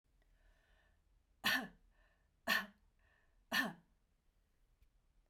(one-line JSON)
{"three_cough_length": "5.3 s", "three_cough_amplitude": 2607, "three_cough_signal_mean_std_ratio": 0.28, "survey_phase": "beta (2021-08-13 to 2022-03-07)", "age": "45-64", "gender": "Female", "wearing_mask": "No", "symptom_none": true, "smoker_status": "Never smoked", "respiratory_condition_asthma": false, "respiratory_condition_other": false, "recruitment_source": "REACT", "submission_delay": "2 days", "covid_test_result": "Negative", "covid_test_method": "RT-qPCR"}